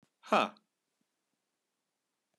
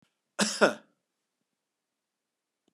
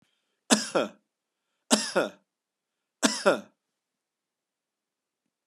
{"exhalation_length": "2.4 s", "exhalation_amplitude": 7921, "exhalation_signal_mean_std_ratio": 0.18, "cough_length": "2.7 s", "cough_amplitude": 17448, "cough_signal_mean_std_ratio": 0.22, "three_cough_length": "5.5 s", "three_cough_amplitude": 20093, "three_cough_signal_mean_std_ratio": 0.28, "survey_phase": "beta (2021-08-13 to 2022-03-07)", "age": "65+", "gender": "Male", "wearing_mask": "No", "symptom_runny_or_blocked_nose": true, "smoker_status": "Never smoked", "respiratory_condition_asthma": false, "respiratory_condition_other": false, "recruitment_source": "REACT", "submission_delay": "1 day", "covid_test_result": "Negative", "covid_test_method": "RT-qPCR"}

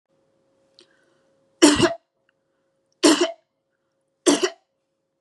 {"three_cough_length": "5.2 s", "three_cough_amplitude": 32005, "three_cough_signal_mean_std_ratio": 0.29, "survey_phase": "beta (2021-08-13 to 2022-03-07)", "age": "45-64", "gender": "Female", "wearing_mask": "No", "symptom_none": true, "smoker_status": "Never smoked", "respiratory_condition_asthma": false, "respiratory_condition_other": false, "recruitment_source": "REACT", "submission_delay": "1 day", "covid_test_result": "Negative", "covid_test_method": "RT-qPCR", "influenza_a_test_result": "Negative", "influenza_b_test_result": "Negative"}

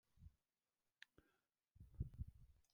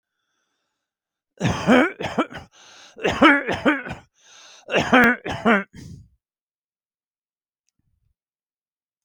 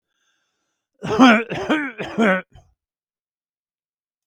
{"exhalation_length": "2.7 s", "exhalation_amplitude": 738, "exhalation_signal_mean_std_ratio": 0.28, "three_cough_length": "9.0 s", "three_cough_amplitude": 26877, "three_cough_signal_mean_std_ratio": 0.36, "cough_length": "4.3 s", "cough_amplitude": 27614, "cough_signal_mean_std_ratio": 0.36, "survey_phase": "beta (2021-08-13 to 2022-03-07)", "age": "65+", "gender": "Male", "wearing_mask": "No", "symptom_none": true, "smoker_status": "Ex-smoker", "respiratory_condition_asthma": false, "respiratory_condition_other": false, "recruitment_source": "REACT", "submission_delay": "3 days", "covid_test_result": "Negative", "covid_test_method": "RT-qPCR"}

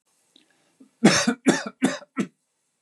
{"cough_length": "2.8 s", "cough_amplitude": 26624, "cough_signal_mean_std_ratio": 0.36, "survey_phase": "beta (2021-08-13 to 2022-03-07)", "age": "45-64", "gender": "Male", "wearing_mask": "No", "symptom_none": true, "smoker_status": "Never smoked", "respiratory_condition_asthma": false, "respiratory_condition_other": false, "recruitment_source": "REACT", "submission_delay": "4 days", "covid_test_result": "Negative", "covid_test_method": "RT-qPCR", "influenza_a_test_result": "Negative", "influenza_b_test_result": "Negative"}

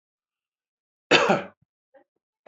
{"cough_length": "2.5 s", "cough_amplitude": 24849, "cough_signal_mean_std_ratio": 0.26, "survey_phase": "beta (2021-08-13 to 2022-03-07)", "age": "45-64", "gender": "Male", "wearing_mask": "No", "symptom_none": true, "smoker_status": "Never smoked", "respiratory_condition_asthma": false, "respiratory_condition_other": false, "recruitment_source": "REACT", "submission_delay": "1 day", "covid_test_result": "Negative", "covid_test_method": "RT-qPCR"}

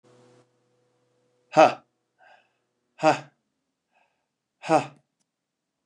{"exhalation_length": "5.9 s", "exhalation_amplitude": 24683, "exhalation_signal_mean_std_ratio": 0.2, "survey_phase": "beta (2021-08-13 to 2022-03-07)", "age": "65+", "gender": "Male", "wearing_mask": "No", "symptom_none": true, "smoker_status": "Never smoked", "respiratory_condition_asthma": false, "respiratory_condition_other": false, "recruitment_source": "REACT", "submission_delay": "1 day", "covid_test_result": "Negative", "covid_test_method": "RT-qPCR"}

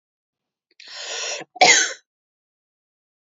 {"cough_length": "3.2 s", "cough_amplitude": 30705, "cough_signal_mean_std_ratio": 0.29, "survey_phase": "beta (2021-08-13 to 2022-03-07)", "age": "18-44", "gender": "Female", "wearing_mask": "No", "symptom_none": true, "symptom_onset": "12 days", "smoker_status": "Never smoked", "respiratory_condition_asthma": true, "respiratory_condition_other": false, "recruitment_source": "REACT", "submission_delay": "2 days", "covid_test_result": "Negative", "covid_test_method": "RT-qPCR", "influenza_a_test_result": "Negative", "influenza_b_test_result": "Negative"}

